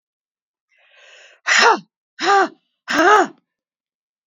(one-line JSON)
{"exhalation_length": "4.3 s", "exhalation_amplitude": 30565, "exhalation_signal_mean_std_ratio": 0.38, "survey_phase": "beta (2021-08-13 to 2022-03-07)", "age": "45-64", "gender": "Female", "wearing_mask": "No", "symptom_cough_any": true, "symptom_runny_or_blocked_nose": true, "symptom_sore_throat": true, "symptom_abdominal_pain": true, "symptom_diarrhoea": true, "symptom_fatigue": true, "symptom_headache": true, "symptom_change_to_sense_of_smell_or_taste": true, "symptom_onset": "5 days", "smoker_status": "Ex-smoker", "respiratory_condition_asthma": true, "respiratory_condition_other": false, "recruitment_source": "Test and Trace", "submission_delay": "2 days", "covid_test_result": "Positive", "covid_test_method": "LAMP"}